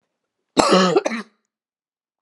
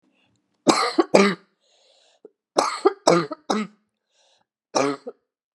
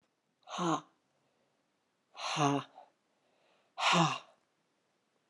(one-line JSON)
{"cough_length": "2.2 s", "cough_amplitude": 32768, "cough_signal_mean_std_ratio": 0.38, "three_cough_length": "5.5 s", "three_cough_amplitude": 32767, "three_cough_signal_mean_std_ratio": 0.36, "exhalation_length": "5.3 s", "exhalation_amplitude": 5422, "exhalation_signal_mean_std_ratio": 0.35, "survey_phase": "beta (2021-08-13 to 2022-03-07)", "age": "45-64", "gender": "Female", "wearing_mask": "No", "symptom_cough_any": true, "symptom_new_continuous_cough": true, "symptom_runny_or_blocked_nose": true, "symptom_fatigue": true, "symptom_fever_high_temperature": true, "symptom_headache": true, "symptom_other": true, "symptom_onset": "3 days", "smoker_status": "Ex-smoker", "respiratory_condition_asthma": false, "respiratory_condition_other": false, "recruitment_source": "Test and Trace", "submission_delay": "2 days", "covid_test_result": "Positive", "covid_test_method": "RT-qPCR", "covid_ct_value": 23.4, "covid_ct_gene": "ORF1ab gene", "covid_ct_mean": 24.2, "covid_viral_load": "12000 copies/ml", "covid_viral_load_category": "Low viral load (10K-1M copies/ml)"}